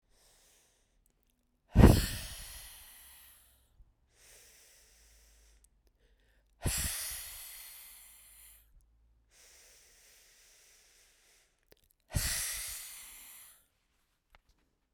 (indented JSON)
{
  "exhalation_length": "14.9 s",
  "exhalation_amplitude": 18859,
  "exhalation_signal_mean_std_ratio": 0.22,
  "survey_phase": "beta (2021-08-13 to 2022-03-07)",
  "age": "45-64",
  "gender": "Female",
  "wearing_mask": "No",
  "symptom_cough_any": true,
  "symptom_runny_or_blocked_nose": true,
  "symptom_shortness_of_breath": true,
  "symptom_fatigue": true,
  "symptom_headache": true,
  "symptom_change_to_sense_of_smell_or_taste": true,
  "symptom_onset": "5 days",
  "smoker_status": "Never smoked",
  "respiratory_condition_asthma": false,
  "respiratory_condition_other": false,
  "recruitment_source": "Test and Trace",
  "submission_delay": "2 days",
  "covid_test_result": "Positive",
  "covid_test_method": "RT-qPCR"
}